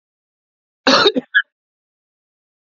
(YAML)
cough_length: 2.7 s
cough_amplitude: 29735
cough_signal_mean_std_ratio: 0.29
survey_phase: alpha (2021-03-01 to 2021-08-12)
age: 18-44
gender: Male
wearing_mask: 'No'
symptom_cough_any: true
symptom_diarrhoea: true
symptom_fever_high_temperature: true
symptom_headache: true
symptom_change_to_sense_of_smell_or_taste: true
symptom_onset: 4 days
smoker_status: Current smoker (1 to 10 cigarettes per day)
respiratory_condition_asthma: false
respiratory_condition_other: false
recruitment_source: Test and Trace
submission_delay: 1 day
covid_test_result: Positive
covid_test_method: RT-qPCR